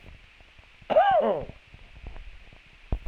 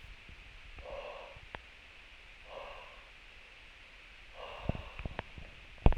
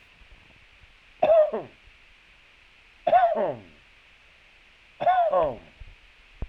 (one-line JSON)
{"cough_length": "3.1 s", "cough_amplitude": 11373, "cough_signal_mean_std_ratio": 0.44, "exhalation_length": "6.0 s", "exhalation_amplitude": 16953, "exhalation_signal_mean_std_ratio": 0.31, "three_cough_length": "6.5 s", "three_cough_amplitude": 12402, "three_cough_signal_mean_std_ratio": 0.41, "survey_phase": "alpha (2021-03-01 to 2021-08-12)", "age": "45-64", "gender": "Male", "wearing_mask": "No", "symptom_none": true, "smoker_status": "Never smoked", "respiratory_condition_asthma": false, "respiratory_condition_other": false, "recruitment_source": "REACT", "submission_delay": "3 days", "covid_test_result": "Negative", "covid_test_method": "RT-qPCR"}